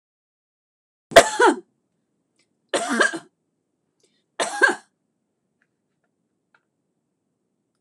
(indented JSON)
{
  "three_cough_length": "7.8 s",
  "three_cough_amplitude": 26028,
  "three_cough_signal_mean_std_ratio": 0.23,
  "survey_phase": "beta (2021-08-13 to 2022-03-07)",
  "age": "65+",
  "gender": "Female",
  "wearing_mask": "No",
  "symptom_none": true,
  "smoker_status": "Ex-smoker",
  "respiratory_condition_asthma": false,
  "respiratory_condition_other": false,
  "recruitment_source": "REACT",
  "submission_delay": "2 days",
  "covid_test_result": "Negative",
  "covid_test_method": "RT-qPCR"
}